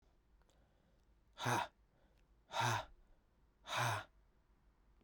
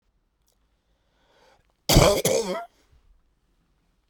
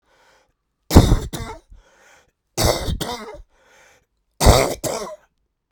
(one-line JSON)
{"exhalation_length": "5.0 s", "exhalation_amplitude": 2064, "exhalation_signal_mean_std_ratio": 0.38, "cough_length": "4.1 s", "cough_amplitude": 27552, "cough_signal_mean_std_ratio": 0.3, "three_cough_length": "5.7 s", "three_cough_amplitude": 32768, "three_cough_signal_mean_std_ratio": 0.35, "survey_phase": "beta (2021-08-13 to 2022-03-07)", "age": "45-64", "gender": "Male", "wearing_mask": "No", "symptom_none": true, "smoker_status": "Never smoked", "respiratory_condition_asthma": false, "respiratory_condition_other": false, "recruitment_source": "REACT", "submission_delay": "2 days", "covid_test_result": "Negative", "covid_test_method": "RT-qPCR"}